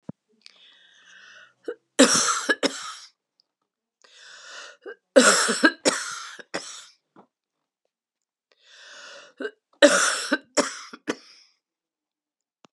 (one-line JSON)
{"three_cough_length": "12.7 s", "three_cough_amplitude": 31805, "three_cough_signal_mean_std_ratio": 0.31, "survey_phase": "beta (2021-08-13 to 2022-03-07)", "age": "65+", "gender": "Female", "wearing_mask": "No", "symptom_cough_any": true, "symptom_runny_or_blocked_nose": true, "symptom_change_to_sense_of_smell_or_taste": true, "symptom_onset": "5 days", "smoker_status": "Never smoked", "respiratory_condition_asthma": false, "respiratory_condition_other": false, "recruitment_source": "Test and Trace", "submission_delay": "3 days", "covid_test_result": "Positive", "covid_test_method": "RT-qPCR", "covid_ct_value": 14.8, "covid_ct_gene": "N gene", "covid_ct_mean": 16.5, "covid_viral_load": "3800000 copies/ml", "covid_viral_load_category": "High viral load (>1M copies/ml)"}